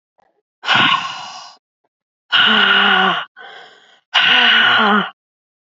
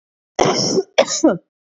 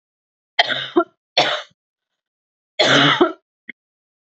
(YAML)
exhalation_length: 5.6 s
exhalation_amplitude: 29793
exhalation_signal_mean_std_ratio: 0.59
cough_length: 1.8 s
cough_amplitude: 31725
cough_signal_mean_std_ratio: 0.51
three_cough_length: 4.4 s
three_cough_amplitude: 28853
three_cough_signal_mean_std_ratio: 0.38
survey_phase: beta (2021-08-13 to 2022-03-07)
age: 18-44
gender: Female
wearing_mask: 'No'
symptom_shortness_of_breath: true
symptom_fatigue: true
symptom_headache: true
symptom_other: true
symptom_onset: 9 days
smoker_status: Ex-smoker
respiratory_condition_asthma: true
respiratory_condition_other: false
recruitment_source: Test and Trace
submission_delay: 2 days
covid_test_result: Positive
covid_test_method: RT-qPCR
covid_ct_value: 23.6
covid_ct_gene: ORF1ab gene
covid_ct_mean: 24.0
covid_viral_load: 13000 copies/ml
covid_viral_load_category: Low viral load (10K-1M copies/ml)